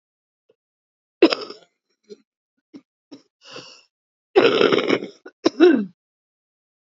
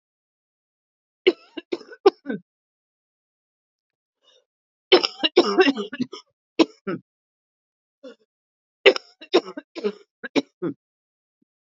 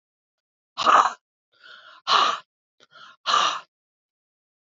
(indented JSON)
{
  "cough_length": "6.9 s",
  "cough_amplitude": 30865,
  "cough_signal_mean_std_ratio": 0.3,
  "three_cough_length": "11.7 s",
  "three_cough_amplitude": 28728,
  "three_cough_signal_mean_std_ratio": 0.24,
  "exhalation_length": "4.8 s",
  "exhalation_amplitude": 26883,
  "exhalation_signal_mean_std_ratio": 0.34,
  "survey_phase": "beta (2021-08-13 to 2022-03-07)",
  "age": "65+",
  "gender": "Female",
  "wearing_mask": "No",
  "symptom_cough_any": true,
  "symptom_sore_throat": true,
  "symptom_fatigue": true,
  "symptom_headache": true,
  "symptom_change_to_sense_of_smell_or_taste": true,
  "symptom_other": true,
  "symptom_onset": "3 days",
  "smoker_status": "Never smoked",
  "respiratory_condition_asthma": false,
  "respiratory_condition_other": false,
  "recruitment_source": "Test and Trace",
  "submission_delay": "1 day",
  "covid_test_result": "Positive",
  "covid_test_method": "RT-qPCR",
  "covid_ct_value": 21.8,
  "covid_ct_gene": "ORF1ab gene"
}